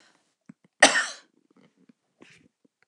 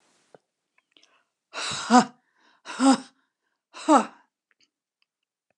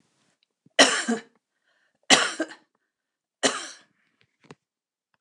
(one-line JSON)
{"cough_length": "2.9 s", "cough_amplitude": 28482, "cough_signal_mean_std_ratio": 0.2, "exhalation_length": "5.6 s", "exhalation_amplitude": 24676, "exhalation_signal_mean_std_ratio": 0.26, "three_cough_length": "5.2 s", "three_cough_amplitude": 29203, "three_cough_signal_mean_std_ratio": 0.27, "survey_phase": "beta (2021-08-13 to 2022-03-07)", "age": "65+", "gender": "Female", "wearing_mask": "No", "symptom_none": true, "smoker_status": "Never smoked", "respiratory_condition_asthma": false, "respiratory_condition_other": false, "recruitment_source": "REACT", "submission_delay": "2 days", "covid_test_result": "Negative", "covid_test_method": "RT-qPCR", "influenza_a_test_result": "Unknown/Void", "influenza_b_test_result": "Unknown/Void"}